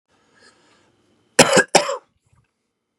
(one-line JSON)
{"cough_length": "3.0 s", "cough_amplitude": 32768, "cough_signal_mean_std_ratio": 0.26, "survey_phase": "beta (2021-08-13 to 2022-03-07)", "age": "18-44", "gender": "Male", "wearing_mask": "No", "symptom_none": true, "smoker_status": "Ex-smoker", "respiratory_condition_asthma": false, "respiratory_condition_other": false, "recruitment_source": "REACT", "submission_delay": "4 days", "covid_test_result": "Negative", "covid_test_method": "RT-qPCR", "influenza_a_test_result": "Negative", "influenza_b_test_result": "Negative"}